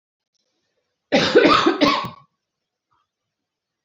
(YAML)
cough_length: 3.8 s
cough_amplitude: 28677
cough_signal_mean_std_ratio: 0.38
survey_phase: beta (2021-08-13 to 2022-03-07)
age: 45-64
gender: Female
wearing_mask: 'No'
symptom_cough_any: true
symptom_new_continuous_cough: true
symptom_runny_or_blocked_nose: true
symptom_sore_throat: true
symptom_diarrhoea: true
symptom_fatigue: true
symptom_headache: true
symptom_onset: 2 days
smoker_status: Never smoked
respiratory_condition_asthma: false
respiratory_condition_other: false
recruitment_source: Test and Trace
submission_delay: 1 day
covid_test_result: Positive
covid_test_method: RT-qPCR
covid_ct_value: 17.9
covid_ct_gene: ORF1ab gene
covid_ct_mean: 18.4
covid_viral_load: 950000 copies/ml
covid_viral_load_category: Low viral load (10K-1M copies/ml)